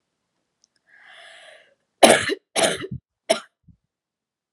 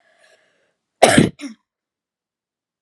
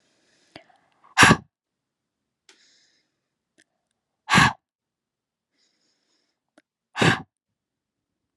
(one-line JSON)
{"three_cough_length": "4.5 s", "three_cough_amplitude": 32768, "three_cough_signal_mean_std_ratio": 0.26, "cough_length": "2.8 s", "cough_amplitude": 32768, "cough_signal_mean_std_ratio": 0.24, "exhalation_length": "8.4 s", "exhalation_amplitude": 31765, "exhalation_signal_mean_std_ratio": 0.2, "survey_phase": "alpha (2021-03-01 to 2021-08-12)", "age": "18-44", "gender": "Female", "wearing_mask": "No", "symptom_none": true, "symptom_onset": "2 days", "smoker_status": "Never smoked", "respiratory_condition_asthma": true, "respiratory_condition_other": false, "recruitment_source": "Test and Trace", "submission_delay": "2 days", "covid_test_result": "Positive", "covid_test_method": "RT-qPCR", "covid_ct_value": 25.2, "covid_ct_gene": "ORF1ab gene", "covid_ct_mean": 25.4, "covid_viral_load": "4700 copies/ml", "covid_viral_load_category": "Minimal viral load (< 10K copies/ml)"}